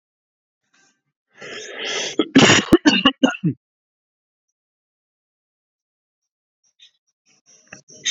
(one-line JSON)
{"cough_length": "8.1 s", "cough_amplitude": 32575, "cough_signal_mean_std_ratio": 0.28, "survey_phase": "alpha (2021-03-01 to 2021-08-12)", "age": "45-64", "gender": "Male", "wearing_mask": "No", "symptom_cough_any": true, "symptom_fatigue": true, "symptom_fever_high_temperature": true, "symptom_change_to_sense_of_smell_or_taste": true, "symptom_onset": "5 days", "smoker_status": "Never smoked", "respiratory_condition_asthma": false, "respiratory_condition_other": false, "recruitment_source": "Test and Trace", "submission_delay": "2 days", "covid_test_result": "Positive", "covid_test_method": "RT-qPCR", "covid_ct_value": 11.7, "covid_ct_gene": "ORF1ab gene", "covid_ct_mean": 11.9, "covid_viral_load": "120000000 copies/ml", "covid_viral_load_category": "High viral load (>1M copies/ml)"}